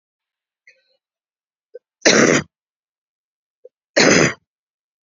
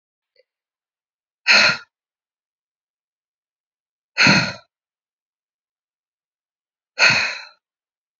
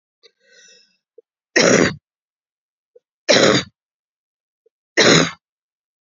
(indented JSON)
{
  "cough_length": "5.0 s",
  "cough_amplitude": 31767,
  "cough_signal_mean_std_ratio": 0.3,
  "exhalation_length": "8.2 s",
  "exhalation_amplitude": 32636,
  "exhalation_signal_mean_std_ratio": 0.26,
  "three_cough_length": "6.1 s",
  "three_cough_amplitude": 31975,
  "three_cough_signal_mean_std_ratio": 0.33,
  "survey_phase": "beta (2021-08-13 to 2022-03-07)",
  "age": "18-44",
  "gender": "Female",
  "wearing_mask": "No",
  "symptom_cough_any": true,
  "symptom_runny_or_blocked_nose": true,
  "symptom_fatigue": true,
  "symptom_onset": "4 days",
  "smoker_status": "Never smoked",
  "respiratory_condition_asthma": false,
  "respiratory_condition_other": false,
  "recruitment_source": "Test and Trace",
  "submission_delay": "1 day",
  "covid_test_result": "Positive",
  "covid_test_method": "RT-qPCR",
  "covid_ct_value": 19.6,
  "covid_ct_gene": "ORF1ab gene"
}